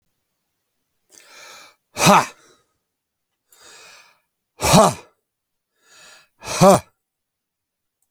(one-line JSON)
{"exhalation_length": "8.1 s", "exhalation_amplitude": 32767, "exhalation_signal_mean_std_ratio": 0.26, "survey_phase": "alpha (2021-03-01 to 2021-08-12)", "age": "65+", "gender": "Male", "wearing_mask": "No", "symptom_none": true, "smoker_status": "Never smoked", "respiratory_condition_asthma": false, "respiratory_condition_other": false, "recruitment_source": "REACT", "submission_delay": "1 day", "covid_test_result": "Negative", "covid_test_method": "RT-qPCR"}